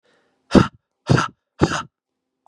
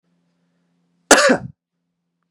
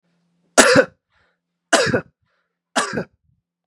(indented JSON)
{
  "exhalation_length": "2.5 s",
  "exhalation_amplitude": 32768,
  "exhalation_signal_mean_std_ratio": 0.31,
  "cough_length": "2.3 s",
  "cough_amplitude": 32768,
  "cough_signal_mean_std_ratio": 0.27,
  "three_cough_length": "3.7 s",
  "three_cough_amplitude": 32768,
  "three_cough_signal_mean_std_ratio": 0.33,
  "survey_phase": "beta (2021-08-13 to 2022-03-07)",
  "age": "18-44",
  "gender": "Male",
  "wearing_mask": "No",
  "symptom_sore_throat": true,
  "symptom_onset": "2 days",
  "smoker_status": "Never smoked",
  "respiratory_condition_asthma": false,
  "respiratory_condition_other": false,
  "recruitment_source": "Test and Trace",
  "submission_delay": "1 day",
  "covid_test_result": "Negative",
  "covid_test_method": "RT-qPCR"
}